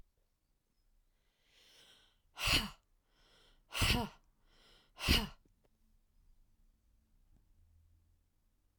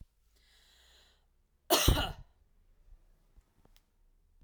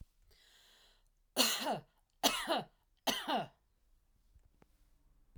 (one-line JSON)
{"exhalation_length": "8.8 s", "exhalation_amplitude": 4847, "exhalation_signal_mean_std_ratio": 0.26, "cough_length": "4.4 s", "cough_amplitude": 9238, "cough_signal_mean_std_ratio": 0.25, "three_cough_length": "5.4 s", "three_cough_amplitude": 8313, "three_cough_signal_mean_std_ratio": 0.37, "survey_phase": "alpha (2021-03-01 to 2021-08-12)", "age": "45-64", "gender": "Female", "wearing_mask": "No", "symptom_none": true, "smoker_status": "Never smoked", "respiratory_condition_asthma": false, "respiratory_condition_other": false, "recruitment_source": "REACT", "submission_delay": "2 days", "covid_test_result": "Negative", "covid_test_method": "RT-qPCR"}